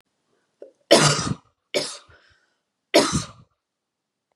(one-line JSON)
{"three_cough_length": "4.4 s", "three_cough_amplitude": 32718, "three_cough_signal_mean_std_ratio": 0.32, "survey_phase": "beta (2021-08-13 to 2022-03-07)", "age": "18-44", "gender": "Female", "wearing_mask": "No", "symptom_none": true, "smoker_status": "Never smoked", "respiratory_condition_asthma": false, "respiratory_condition_other": false, "recruitment_source": "REACT", "submission_delay": "2 days", "covid_test_result": "Negative", "covid_test_method": "RT-qPCR", "influenza_a_test_result": "Negative", "influenza_b_test_result": "Negative"}